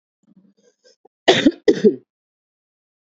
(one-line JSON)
{"cough_length": "3.2 s", "cough_amplitude": 29327, "cough_signal_mean_std_ratio": 0.27, "survey_phase": "beta (2021-08-13 to 2022-03-07)", "age": "18-44", "gender": "Female", "wearing_mask": "No", "symptom_cough_any": true, "symptom_runny_or_blocked_nose": true, "symptom_sore_throat": true, "symptom_headache": true, "symptom_onset": "13 days", "smoker_status": "Current smoker (11 or more cigarettes per day)", "respiratory_condition_asthma": false, "respiratory_condition_other": true, "recruitment_source": "REACT", "submission_delay": "1 day", "covid_test_result": "Negative", "covid_test_method": "RT-qPCR", "influenza_a_test_result": "Unknown/Void", "influenza_b_test_result": "Unknown/Void"}